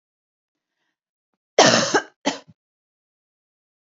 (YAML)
cough_length: 3.8 s
cough_amplitude: 30002
cough_signal_mean_std_ratio: 0.26
survey_phase: beta (2021-08-13 to 2022-03-07)
age: 18-44
gender: Female
wearing_mask: 'No'
symptom_cough_any: true
symptom_sore_throat: true
symptom_onset: 5 days
smoker_status: Never smoked
respiratory_condition_asthma: false
respiratory_condition_other: false
recruitment_source: REACT
submission_delay: 4 days
covid_test_result: Negative
covid_test_method: RT-qPCR
influenza_a_test_result: Negative
influenza_b_test_result: Negative